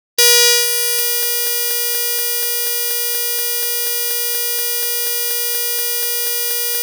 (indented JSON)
{
  "exhalation_length": "6.8 s",
  "exhalation_amplitude": 32767,
  "exhalation_signal_mean_std_ratio": 1.21,
  "survey_phase": "alpha (2021-03-01 to 2021-08-12)",
  "age": "65+",
  "gender": "Female",
  "wearing_mask": "No",
  "symptom_cough_any": true,
  "symptom_fatigue": true,
  "symptom_headache": true,
  "symptom_onset": "9 days",
  "smoker_status": "Ex-smoker",
  "respiratory_condition_asthma": false,
  "respiratory_condition_other": false,
  "recruitment_source": "REACT",
  "submission_delay": "7 days",
  "covid_test_result": "Negative",
  "covid_test_method": "RT-qPCR"
}